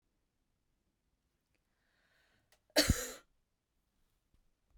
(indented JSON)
{
  "cough_length": "4.8 s",
  "cough_amplitude": 7167,
  "cough_signal_mean_std_ratio": 0.18,
  "survey_phase": "beta (2021-08-13 to 2022-03-07)",
  "age": "45-64",
  "gender": "Female",
  "wearing_mask": "No",
  "symptom_none": true,
  "smoker_status": "Never smoked",
  "respiratory_condition_asthma": false,
  "respiratory_condition_other": false,
  "recruitment_source": "REACT",
  "submission_delay": "2 days",
  "covid_test_result": "Negative",
  "covid_test_method": "RT-qPCR",
  "influenza_a_test_result": "Unknown/Void",
  "influenza_b_test_result": "Unknown/Void"
}